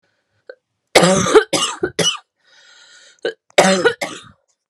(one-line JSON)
{"cough_length": "4.7 s", "cough_amplitude": 32768, "cough_signal_mean_std_ratio": 0.41, "survey_phase": "alpha (2021-03-01 to 2021-08-12)", "age": "18-44", "gender": "Female", "wearing_mask": "No", "symptom_cough_any": true, "symptom_onset": "8 days", "smoker_status": "Never smoked", "respiratory_condition_asthma": false, "respiratory_condition_other": true, "recruitment_source": "Test and Trace", "submission_delay": "2 days", "covid_test_result": "Positive", "covid_test_method": "RT-qPCR"}